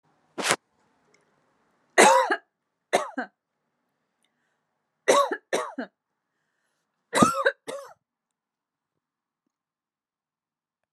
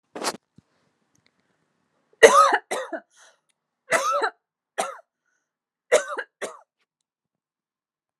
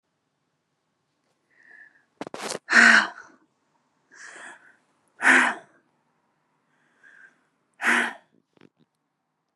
{"three_cough_length": "10.9 s", "three_cough_amplitude": 32710, "three_cough_signal_mean_std_ratio": 0.27, "cough_length": "8.2 s", "cough_amplitude": 32767, "cough_signal_mean_std_ratio": 0.27, "exhalation_length": "9.6 s", "exhalation_amplitude": 29062, "exhalation_signal_mean_std_ratio": 0.26, "survey_phase": "alpha (2021-03-01 to 2021-08-12)", "age": "18-44", "gender": "Female", "wearing_mask": "No", "symptom_none": true, "smoker_status": "Never smoked", "respiratory_condition_asthma": false, "respiratory_condition_other": false, "recruitment_source": "REACT", "submission_delay": "2 days", "covid_test_result": "Negative", "covid_test_method": "RT-qPCR"}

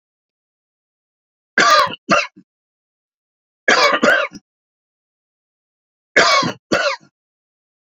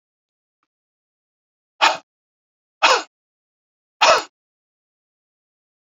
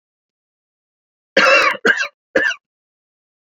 {"three_cough_length": "7.9 s", "three_cough_amplitude": 31947, "three_cough_signal_mean_std_ratio": 0.37, "exhalation_length": "5.8 s", "exhalation_amplitude": 31786, "exhalation_signal_mean_std_ratio": 0.23, "cough_length": "3.6 s", "cough_amplitude": 32039, "cough_signal_mean_std_ratio": 0.37, "survey_phase": "beta (2021-08-13 to 2022-03-07)", "age": "65+", "gender": "Male", "wearing_mask": "No", "symptom_cough_any": true, "smoker_status": "Never smoked", "respiratory_condition_asthma": false, "respiratory_condition_other": false, "recruitment_source": "REACT", "submission_delay": "2 days", "covid_test_result": "Negative", "covid_test_method": "RT-qPCR"}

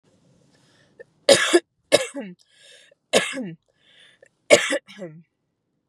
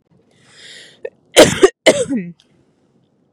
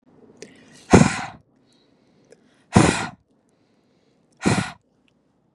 {"three_cough_length": "5.9 s", "three_cough_amplitude": 32768, "three_cough_signal_mean_std_ratio": 0.29, "cough_length": "3.3 s", "cough_amplitude": 32768, "cough_signal_mean_std_ratio": 0.31, "exhalation_length": "5.5 s", "exhalation_amplitude": 32768, "exhalation_signal_mean_std_ratio": 0.27, "survey_phase": "beta (2021-08-13 to 2022-03-07)", "age": "18-44", "gender": "Female", "wearing_mask": "No", "symptom_none": true, "smoker_status": "Ex-smoker", "respiratory_condition_asthma": false, "respiratory_condition_other": false, "recruitment_source": "REACT", "submission_delay": "2 days", "covid_test_result": "Negative", "covid_test_method": "RT-qPCR", "influenza_a_test_result": "Negative", "influenza_b_test_result": "Negative"}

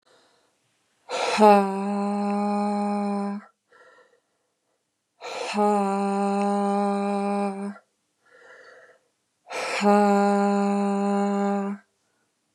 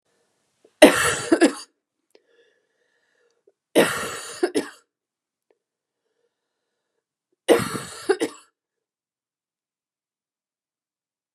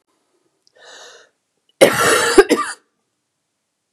{"exhalation_length": "12.5 s", "exhalation_amplitude": 25057, "exhalation_signal_mean_std_ratio": 0.57, "three_cough_length": "11.3 s", "three_cough_amplitude": 32768, "three_cough_signal_mean_std_ratio": 0.25, "cough_length": "3.9 s", "cough_amplitude": 32768, "cough_signal_mean_std_ratio": 0.33, "survey_phase": "beta (2021-08-13 to 2022-03-07)", "age": "45-64", "gender": "Female", "wearing_mask": "No", "symptom_headache": true, "smoker_status": "Ex-smoker", "respiratory_condition_asthma": false, "respiratory_condition_other": false, "recruitment_source": "REACT", "submission_delay": "2 days", "covid_test_result": "Negative", "covid_test_method": "RT-qPCR", "influenza_a_test_result": "Negative", "influenza_b_test_result": "Negative"}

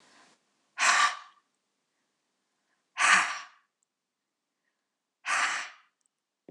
{"exhalation_length": "6.5 s", "exhalation_amplitude": 13893, "exhalation_signal_mean_std_ratio": 0.32, "survey_phase": "beta (2021-08-13 to 2022-03-07)", "age": "65+", "gender": "Female", "wearing_mask": "No", "symptom_none": true, "smoker_status": "Never smoked", "respiratory_condition_asthma": false, "respiratory_condition_other": false, "recruitment_source": "REACT", "submission_delay": "2 days", "covid_test_result": "Negative", "covid_test_method": "RT-qPCR", "influenza_a_test_result": "Negative", "influenza_b_test_result": "Negative"}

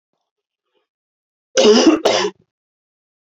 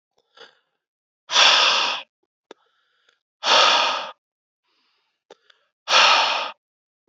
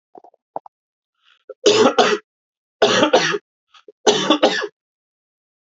{"cough_length": "3.3 s", "cough_amplitude": 29407, "cough_signal_mean_std_ratio": 0.36, "exhalation_length": "7.1 s", "exhalation_amplitude": 28287, "exhalation_signal_mean_std_ratio": 0.41, "three_cough_length": "5.6 s", "three_cough_amplitude": 31175, "three_cough_signal_mean_std_ratio": 0.42, "survey_phase": "alpha (2021-03-01 to 2021-08-12)", "age": "18-44", "gender": "Male", "wearing_mask": "No", "symptom_cough_any": true, "smoker_status": "Never smoked", "respiratory_condition_asthma": false, "respiratory_condition_other": false, "recruitment_source": "Test and Trace", "submission_delay": "2 days", "covid_test_result": "Positive", "covid_test_method": "RT-qPCR", "covid_ct_value": 27.0, "covid_ct_gene": "ORF1ab gene", "covid_ct_mean": 27.5, "covid_viral_load": "930 copies/ml", "covid_viral_load_category": "Minimal viral load (< 10K copies/ml)"}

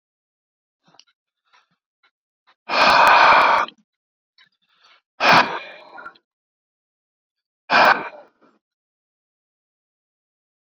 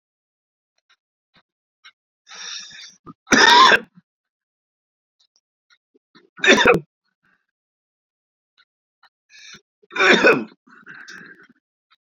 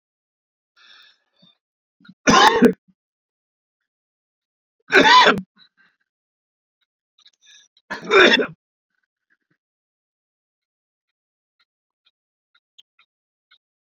{"exhalation_length": "10.7 s", "exhalation_amplitude": 28202, "exhalation_signal_mean_std_ratio": 0.31, "cough_length": "12.1 s", "cough_amplitude": 32767, "cough_signal_mean_std_ratio": 0.27, "three_cough_length": "13.8 s", "three_cough_amplitude": 32767, "three_cough_signal_mean_std_ratio": 0.24, "survey_phase": "beta (2021-08-13 to 2022-03-07)", "age": "65+", "gender": "Male", "wearing_mask": "No", "symptom_none": true, "smoker_status": "Current smoker (11 or more cigarettes per day)", "respiratory_condition_asthma": false, "respiratory_condition_other": false, "recruitment_source": "REACT", "submission_delay": "1 day", "covid_test_result": "Negative", "covid_test_method": "RT-qPCR"}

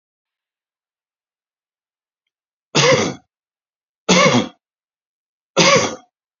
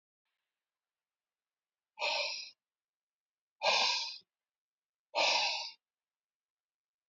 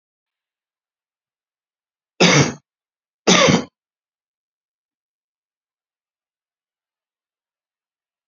{"three_cough_length": "6.4 s", "three_cough_amplitude": 32767, "three_cough_signal_mean_std_ratio": 0.33, "exhalation_length": "7.1 s", "exhalation_amplitude": 5227, "exhalation_signal_mean_std_ratio": 0.36, "cough_length": "8.3 s", "cough_amplitude": 32527, "cough_signal_mean_std_ratio": 0.22, "survey_phase": "alpha (2021-03-01 to 2021-08-12)", "age": "45-64", "gender": "Male", "wearing_mask": "No", "symptom_none": true, "smoker_status": "Ex-smoker", "respiratory_condition_asthma": false, "respiratory_condition_other": false, "recruitment_source": "REACT", "submission_delay": "1 day", "covid_test_result": "Negative", "covid_test_method": "RT-qPCR"}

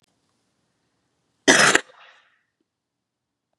{"cough_length": "3.6 s", "cough_amplitude": 32767, "cough_signal_mean_std_ratio": 0.22, "survey_phase": "beta (2021-08-13 to 2022-03-07)", "age": "65+", "gender": "Female", "wearing_mask": "No", "symptom_none": true, "symptom_onset": "12 days", "smoker_status": "Ex-smoker", "respiratory_condition_asthma": false, "respiratory_condition_other": false, "recruitment_source": "REACT", "submission_delay": "1 day", "covid_test_result": "Negative", "covid_test_method": "RT-qPCR", "influenza_a_test_result": "Negative", "influenza_b_test_result": "Negative"}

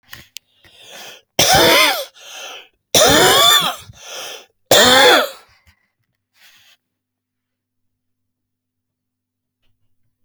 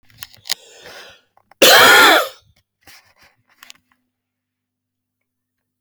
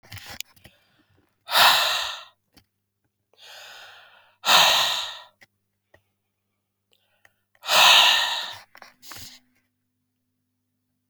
{"three_cough_length": "10.2 s", "three_cough_amplitude": 32767, "three_cough_signal_mean_std_ratio": 0.39, "cough_length": "5.8 s", "cough_amplitude": 32767, "cough_signal_mean_std_ratio": 0.3, "exhalation_length": "11.1 s", "exhalation_amplitude": 26919, "exhalation_signal_mean_std_ratio": 0.34, "survey_phase": "beta (2021-08-13 to 2022-03-07)", "age": "45-64", "gender": "Male", "wearing_mask": "Yes", "symptom_cough_any": true, "symptom_runny_or_blocked_nose": true, "symptom_sore_throat": true, "symptom_abdominal_pain": true, "symptom_headache": true, "symptom_onset": "1 day", "smoker_status": "Never smoked", "respiratory_condition_asthma": true, "respiratory_condition_other": false, "recruitment_source": "Test and Trace", "submission_delay": "1 day", "covid_test_result": "Positive", "covid_test_method": "RT-qPCR", "covid_ct_value": 16.8, "covid_ct_gene": "ORF1ab gene", "covid_ct_mean": 16.9, "covid_viral_load": "2800000 copies/ml", "covid_viral_load_category": "High viral load (>1M copies/ml)"}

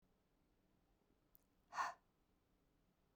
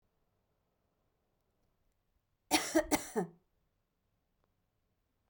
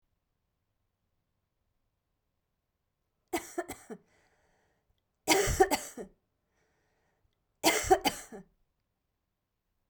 {"exhalation_length": "3.2 s", "exhalation_amplitude": 967, "exhalation_signal_mean_std_ratio": 0.23, "cough_length": "5.3 s", "cough_amplitude": 5758, "cough_signal_mean_std_ratio": 0.23, "three_cough_length": "9.9 s", "three_cough_amplitude": 11060, "three_cough_signal_mean_std_ratio": 0.25, "survey_phase": "beta (2021-08-13 to 2022-03-07)", "age": "45-64", "gender": "Female", "wearing_mask": "No", "symptom_runny_or_blocked_nose": true, "symptom_headache": true, "symptom_change_to_sense_of_smell_or_taste": true, "symptom_onset": "3 days", "smoker_status": "Never smoked", "respiratory_condition_asthma": false, "respiratory_condition_other": false, "recruitment_source": "Test and Trace", "submission_delay": "1 day", "covid_test_result": "Positive", "covid_test_method": "RT-qPCR", "covid_ct_value": 28.1, "covid_ct_gene": "ORF1ab gene"}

